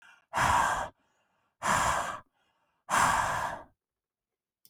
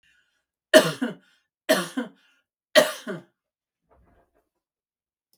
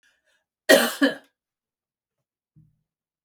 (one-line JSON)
{"exhalation_length": "4.7 s", "exhalation_amplitude": 7583, "exhalation_signal_mean_std_ratio": 0.51, "three_cough_length": "5.4 s", "three_cough_amplitude": 32698, "three_cough_signal_mean_std_ratio": 0.24, "cough_length": "3.2 s", "cough_amplitude": 25618, "cough_signal_mean_std_ratio": 0.23, "survey_phase": "beta (2021-08-13 to 2022-03-07)", "age": "45-64", "gender": "Female", "wearing_mask": "No", "symptom_none": true, "smoker_status": "Never smoked", "respiratory_condition_asthma": false, "respiratory_condition_other": false, "recruitment_source": "REACT", "submission_delay": "2 days", "covid_test_result": "Negative", "covid_test_method": "RT-qPCR", "influenza_a_test_result": "Negative", "influenza_b_test_result": "Negative"}